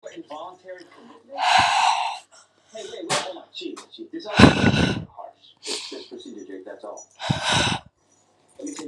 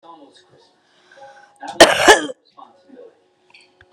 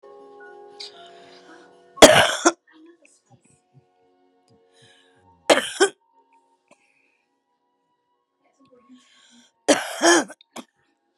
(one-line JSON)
{"exhalation_length": "8.9 s", "exhalation_amplitude": 32768, "exhalation_signal_mean_std_ratio": 0.45, "cough_length": "3.9 s", "cough_amplitude": 32768, "cough_signal_mean_std_ratio": 0.25, "three_cough_length": "11.2 s", "three_cough_amplitude": 32768, "three_cough_signal_mean_std_ratio": 0.23, "survey_phase": "beta (2021-08-13 to 2022-03-07)", "age": "45-64", "gender": "Female", "wearing_mask": "No", "symptom_cough_any": true, "symptom_runny_or_blocked_nose": true, "symptom_sore_throat": true, "symptom_abdominal_pain": true, "symptom_diarrhoea": true, "symptom_fever_high_temperature": true, "symptom_headache": true, "symptom_other": true, "symptom_onset": "3 days", "smoker_status": "Never smoked", "respiratory_condition_asthma": false, "respiratory_condition_other": false, "recruitment_source": "Test and Trace", "submission_delay": "3 days", "covid_test_result": "Positive", "covid_test_method": "RT-qPCR", "covid_ct_value": 22.8, "covid_ct_gene": "ORF1ab gene"}